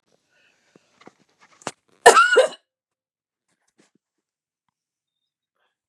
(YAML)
cough_length: 5.9 s
cough_amplitude: 32768
cough_signal_mean_std_ratio: 0.2
survey_phase: beta (2021-08-13 to 2022-03-07)
age: 45-64
gender: Female
wearing_mask: 'No'
symptom_cough_any: true
symptom_fatigue: true
symptom_onset: 7 days
smoker_status: Never smoked
respiratory_condition_asthma: false
respiratory_condition_other: false
recruitment_source: REACT
submission_delay: 2 days
covid_test_result: Positive
covid_test_method: RT-qPCR
covid_ct_value: 27.0
covid_ct_gene: E gene
influenza_a_test_result: Negative
influenza_b_test_result: Negative